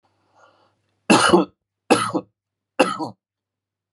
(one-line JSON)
{"three_cough_length": "3.9 s", "three_cough_amplitude": 30814, "three_cough_signal_mean_std_ratio": 0.33, "survey_phase": "beta (2021-08-13 to 2022-03-07)", "age": "45-64", "gender": "Male", "wearing_mask": "No", "symptom_cough_any": true, "symptom_runny_or_blocked_nose": true, "symptom_sore_throat": true, "smoker_status": "Ex-smoker", "respiratory_condition_asthma": false, "respiratory_condition_other": false, "recruitment_source": "REACT", "submission_delay": "4 days", "covid_test_result": "Negative", "covid_test_method": "RT-qPCR"}